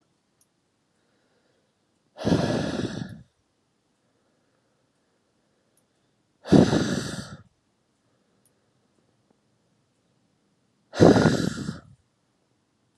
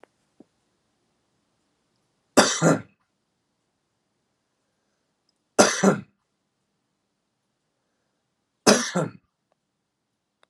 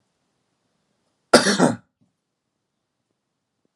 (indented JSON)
{
  "exhalation_length": "13.0 s",
  "exhalation_amplitude": 31027,
  "exhalation_signal_mean_std_ratio": 0.27,
  "three_cough_length": "10.5 s",
  "three_cough_amplitude": 32082,
  "three_cough_signal_mean_std_ratio": 0.23,
  "cough_length": "3.8 s",
  "cough_amplitude": 32768,
  "cough_signal_mean_std_ratio": 0.22,
  "survey_phase": "beta (2021-08-13 to 2022-03-07)",
  "age": "18-44",
  "gender": "Male",
  "wearing_mask": "No",
  "symptom_cough_any": true,
  "symptom_runny_or_blocked_nose": true,
  "symptom_fatigue": true,
  "symptom_onset": "12 days",
  "smoker_status": "Never smoked",
  "respiratory_condition_asthma": false,
  "respiratory_condition_other": false,
  "recruitment_source": "REACT",
  "submission_delay": "6 days",
  "covid_test_result": "Negative",
  "covid_test_method": "RT-qPCR",
  "influenza_a_test_result": "Negative",
  "influenza_b_test_result": "Negative"
}